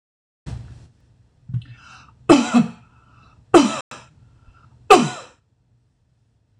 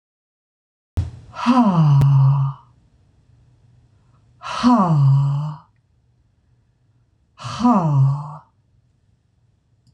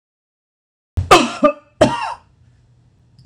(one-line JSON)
{"three_cough_length": "6.6 s", "three_cough_amplitude": 26028, "three_cough_signal_mean_std_ratio": 0.28, "exhalation_length": "9.9 s", "exhalation_amplitude": 24477, "exhalation_signal_mean_std_ratio": 0.5, "cough_length": "3.3 s", "cough_amplitude": 26028, "cough_signal_mean_std_ratio": 0.33, "survey_phase": "beta (2021-08-13 to 2022-03-07)", "age": "45-64", "gender": "Female", "wearing_mask": "No", "symptom_none": true, "smoker_status": "Ex-smoker", "respiratory_condition_asthma": false, "respiratory_condition_other": false, "recruitment_source": "REACT", "submission_delay": "4 days", "covid_test_result": "Negative", "covid_test_method": "RT-qPCR"}